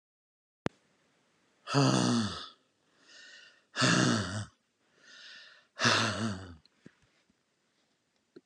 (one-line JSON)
{"exhalation_length": "8.5 s", "exhalation_amplitude": 8962, "exhalation_signal_mean_std_ratio": 0.4, "survey_phase": "beta (2021-08-13 to 2022-03-07)", "age": "65+", "gender": "Male", "wearing_mask": "No", "symptom_none": true, "smoker_status": "Never smoked", "respiratory_condition_asthma": false, "respiratory_condition_other": false, "recruitment_source": "REACT", "submission_delay": "2 days", "covid_test_result": "Negative", "covid_test_method": "RT-qPCR"}